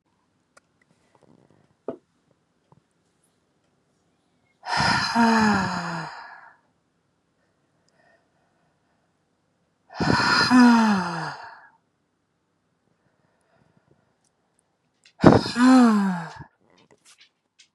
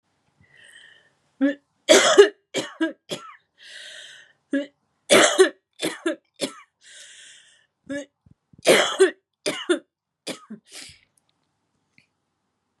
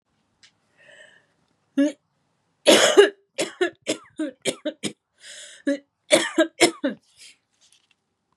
{"exhalation_length": "17.7 s", "exhalation_amplitude": 32767, "exhalation_signal_mean_std_ratio": 0.34, "three_cough_length": "12.8 s", "three_cough_amplitude": 31522, "three_cough_signal_mean_std_ratio": 0.31, "cough_length": "8.4 s", "cough_amplitude": 29140, "cough_signal_mean_std_ratio": 0.32, "survey_phase": "beta (2021-08-13 to 2022-03-07)", "age": "18-44", "gender": "Female", "wearing_mask": "No", "symptom_cough_any": true, "symptom_runny_or_blocked_nose": true, "symptom_shortness_of_breath": true, "symptom_sore_throat": true, "symptom_fatigue": true, "symptom_loss_of_taste": true, "symptom_onset": "5 days", "smoker_status": "Never smoked", "respiratory_condition_asthma": false, "respiratory_condition_other": false, "recruitment_source": "Test and Trace", "submission_delay": "1 day", "covid_test_result": "Positive", "covid_test_method": "RT-qPCR", "covid_ct_value": 14.8, "covid_ct_gene": "ORF1ab gene", "covid_ct_mean": 14.9, "covid_viral_load": "13000000 copies/ml", "covid_viral_load_category": "High viral load (>1M copies/ml)"}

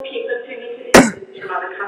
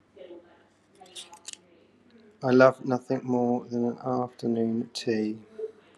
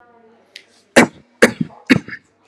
{"cough_length": "1.9 s", "cough_amplitude": 32768, "cough_signal_mean_std_ratio": 0.45, "exhalation_length": "6.0 s", "exhalation_amplitude": 18483, "exhalation_signal_mean_std_ratio": 0.46, "three_cough_length": "2.5 s", "three_cough_amplitude": 32768, "three_cough_signal_mean_std_ratio": 0.27, "survey_phase": "alpha (2021-03-01 to 2021-08-12)", "age": "18-44", "gender": "Male", "wearing_mask": "Yes", "symptom_none": true, "smoker_status": "Never smoked", "respiratory_condition_asthma": false, "respiratory_condition_other": false, "recruitment_source": "Test and Trace", "submission_delay": "0 days", "covid_test_result": "Negative", "covid_test_method": "LFT"}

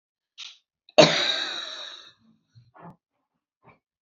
{"cough_length": "4.0 s", "cough_amplitude": 28020, "cough_signal_mean_std_ratio": 0.27, "survey_phase": "beta (2021-08-13 to 2022-03-07)", "age": "65+", "gender": "Female", "wearing_mask": "No", "symptom_none": true, "smoker_status": "Never smoked", "respiratory_condition_asthma": true, "respiratory_condition_other": false, "recruitment_source": "REACT", "submission_delay": "2 days", "covid_test_result": "Negative", "covid_test_method": "RT-qPCR", "influenza_a_test_result": "Negative", "influenza_b_test_result": "Negative"}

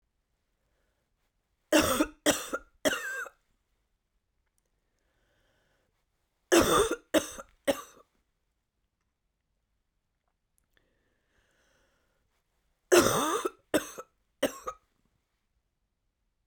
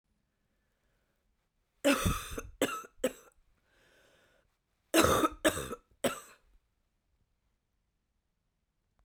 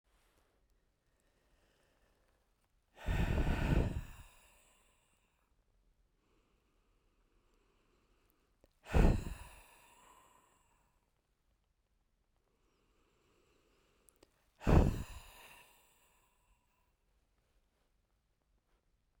{"three_cough_length": "16.5 s", "three_cough_amplitude": 14603, "three_cough_signal_mean_std_ratio": 0.27, "cough_length": "9.0 s", "cough_amplitude": 9448, "cough_signal_mean_std_ratio": 0.3, "exhalation_length": "19.2 s", "exhalation_amplitude": 5708, "exhalation_signal_mean_std_ratio": 0.24, "survey_phase": "beta (2021-08-13 to 2022-03-07)", "age": "18-44", "gender": "Female", "wearing_mask": "No", "symptom_cough_any": true, "symptom_sore_throat": true, "symptom_headache": true, "symptom_other": true, "smoker_status": "Never smoked", "respiratory_condition_asthma": false, "respiratory_condition_other": false, "recruitment_source": "Test and Trace", "submission_delay": "2 days", "covid_test_result": "Positive", "covid_test_method": "LFT"}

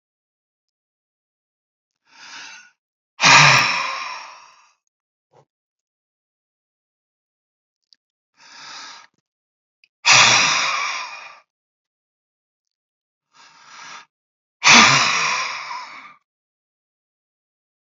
{"exhalation_length": "17.8 s", "exhalation_amplitude": 31035, "exhalation_signal_mean_std_ratio": 0.3, "survey_phase": "beta (2021-08-13 to 2022-03-07)", "age": "65+", "gender": "Male", "wearing_mask": "No", "symptom_none": true, "smoker_status": "Ex-smoker", "respiratory_condition_asthma": false, "respiratory_condition_other": false, "recruitment_source": "REACT", "submission_delay": "4 days", "covid_test_result": "Negative", "covid_test_method": "RT-qPCR", "influenza_a_test_result": "Negative", "influenza_b_test_result": "Negative"}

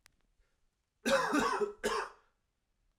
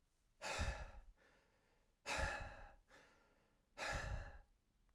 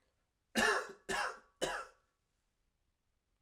{"three_cough_length": "3.0 s", "three_cough_amplitude": 4454, "three_cough_signal_mean_std_ratio": 0.46, "exhalation_length": "4.9 s", "exhalation_amplitude": 1210, "exhalation_signal_mean_std_ratio": 0.51, "cough_length": "3.4 s", "cough_amplitude": 4378, "cough_signal_mean_std_ratio": 0.38, "survey_phase": "alpha (2021-03-01 to 2021-08-12)", "age": "18-44", "gender": "Male", "wearing_mask": "No", "symptom_cough_any": true, "symptom_new_continuous_cough": true, "symptom_fatigue": true, "symptom_fever_high_temperature": true, "symptom_change_to_sense_of_smell_or_taste": true, "symptom_onset": "3 days", "smoker_status": "Never smoked", "respiratory_condition_asthma": false, "respiratory_condition_other": false, "recruitment_source": "Test and Trace", "submission_delay": "2 days", "covid_test_result": "Positive", "covid_test_method": "RT-qPCR", "covid_ct_value": 19.8, "covid_ct_gene": "ORF1ab gene", "covid_ct_mean": 20.3, "covid_viral_load": "220000 copies/ml", "covid_viral_load_category": "Low viral load (10K-1M copies/ml)"}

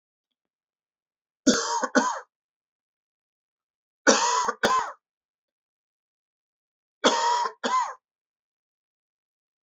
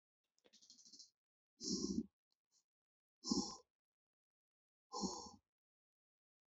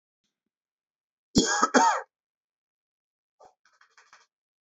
{"three_cough_length": "9.6 s", "three_cough_amplitude": 22842, "three_cough_signal_mean_std_ratio": 0.36, "exhalation_length": "6.5 s", "exhalation_amplitude": 1850, "exhalation_signal_mean_std_ratio": 0.31, "cough_length": "4.6 s", "cough_amplitude": 14935, "cough_signal_mean_std_ratio": 0.27, "survey_phase": "beta (2021-08-13 to 2022-03-07)", "age": "45-64", "gender": "Male", "wearing_mask": "No", "symptom_none": true, "smoker_status": "Never smoked", "respiratory_condition_asthma": false, "respiratory_condition_other": false, "recruitment_source": "REACT", "submission_delay": "0 days", "covid_test_result": "Negative", "covid_test_method": "RT-qPCR", "influenza_a_test_result": "Negative", "influenza_b_test_result": "Negative"}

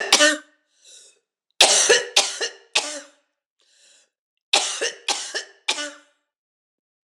{"three_cough_length": "7.1 s", "three_cough_amplitude": 26028, "three_cough_signal_mean_std_ratio": 0.37, "survey_phase": "beta (2021-08-13 to 2022-03-07)", "age": "45-64", "gender": "Female", "wearing_mask": "No", "symptom_cough_any": true, "symptom_shortness_of_breath": true, "symptom_fatigue": true, "symptom_headache": true, "symptom_onset": "3 days", "smoker_status": "Never smoked", "respiratory_condition_asthma": true, "respiratory_condition_other": false, "recruitment_source": "Test and Trace", "submission_delay": "2 days", "covid_test_result": "Positive", "covid_test_method": "RT-qPCR", "covid_ct_value": 14.6, "covid_ct_gene": "ORF1ab gene", "covid_ct_mean": 14.9, "covid_viral_load": "13000000 copies/ml", "covid_viral_load_category": "High viral load (>1M copies/ml)"}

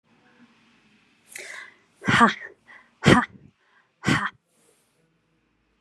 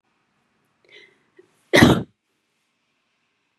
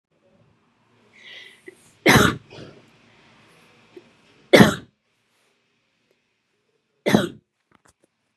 {"exhalation_length": "5.8 s", "exhalation_amplitude": 32287, "exhalation_signal_mean_std_ratio": 0.27, "cough_length": "3.6 s", "cough_amplitude": 32768, "cough_signal_mean_std_ratio": 0.21, "three_cough_length": "8.4 s", "three_cough_amplitude": 32768, "three_cough_signal_mean_std_ratio": 0.22, "survey_phase": "beta (2021-08-13 to 2022-03-07)", "age": "45-64", "gender": "Female", "wearing_mask": "No", "symptom_none": true, "smoker_status": "Never smoked", "respiratory_condition_asthma": false, "respiratory_condition_other": false, "recruitment_source": "REACT", "submission_delay": "3 days", "covid_test_result": "Negative", "covid_test_method": "RT-qPCR", "influenza_a_test_result": "Negative", "influenza_b_test_result": "Negative"}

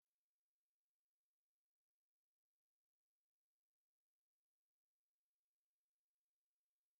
{"three_cough_length": "7.0 s", "three_cough_amplitude": 2, "three_cough_signal_mean_std_ratio": 0.11, "survey_phase": "beta (2021-08-13 to 2022-03-07)", "age": "45-64", "gender": "Male", "wearing_mask": "No", "symptom_runny_or_blocked_nose": true, "symptom_fatigue": true, "symptom_onset": "13 days", "smoker_status": "Never smoked", "respiratory_condition_asthma": false, "respiratory_condition_other": false, "recruitment_source": "REACT", "submission_delay": "1 day", "covid_test_result": "Negative", "covid_test_method": "RT-qPCR"}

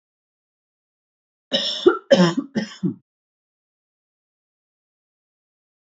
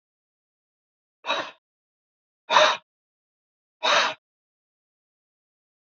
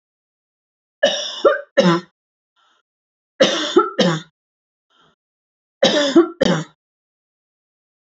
{"cough_length": "6.0 s", "cough_amplitude": 29363, "cough_signal_mean_std_ratio": 0.26, "exhalation_length": "6.0 s", "exhalation_amplitude": 24664, "exhalation_signal_mean_std_ratio": 0.26, "three_cough_length": "8.0 s", "three_cough_amplitude": 31392, "three_cough_signal_mean_std_ratio": 0.37, "survey_phase": "alpha (2021-03-01 to 2021-08-12)", "age": "18-44", "gender": "Female", "wearing_mask": "No", "symptom_none": true, "smoker_status": "Ex-smoker", "respiratory_condition_asthma": false, "respiratory_condition_other": true, "recruitment_source": "REACT", "submission_delay": "2 days", "covid_test_result": "Negative", "covid_test_method": "RT-qPCR"}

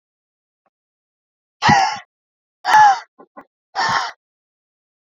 {"exhalation_length": "5.0 s", "exhalation_amplitude": 27838, "exhalation_signal_mean_std_ratio": 0.34, "survey_phase": "beta (2021-08-13 to 2022-03-07)", "age": "18-44", "gender": "Female", "wearing_mask": "No", "symptom_none": true, "smoker_status": "Never smoked", "respiratory_condition_asthma": false, "respiratory_condition_other": false, "recruitment_source": "REACT", "submission_delay": "2 days", "covid_test_result": "Negative", "covid_test_method": "RT-qPCR"}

